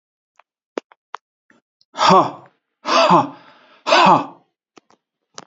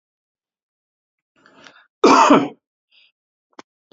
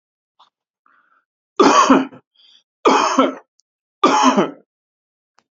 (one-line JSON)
{"exhalation_length": "5.5 s", "exhalation_amplitude": 29210, "exhalation_signal_mean_std_ratio": 0.36, "cough_length": "3.9 s", "cough_amplitude": 31423, "cough_signal_mean_std_ratio": 0.27, "three_cough_length": "5.5 s", "three_cough_amplitude": 29038, "three_cough_signal_mean_std_ratio": 0.4, "survey_phase": "beta (2021-08-13 to 2022-03-07)", "age": "45-64", "gender": "Male", "wearing_mask": "No", "symptom_none": true, "smoker_status": "Never smoked", "respiratory_condition_asthma": false, "respiratory_condition_other": false, "recruitment_source": "REACT", "submission_delay": "2 days", "covid_test_result": "Negative", "covid_test_method": "RT-qPCR"}